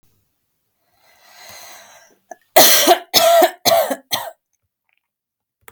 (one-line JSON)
{"cough_length": "5.7 s", "cough_amplitude": 32768, "cough_signal_mean_std_ratio": 0.37, "survey_phase": "alpha (2021-03-01 to 2021-08-12)", "age": "18-44", "gender": "Female", "wearing_mask": "No", "symptom_fatigue": true, "symptom_onset": "13 days", "smoker_status": "Ex-smoker", "respiratory_condition_asthma": false, "respiratory_condition_other": false, "recruitment_source": "REACT", "submission_delay": "2 days", "covid_test_result": "Negative", "covid_test_method": "RT-qPCR"}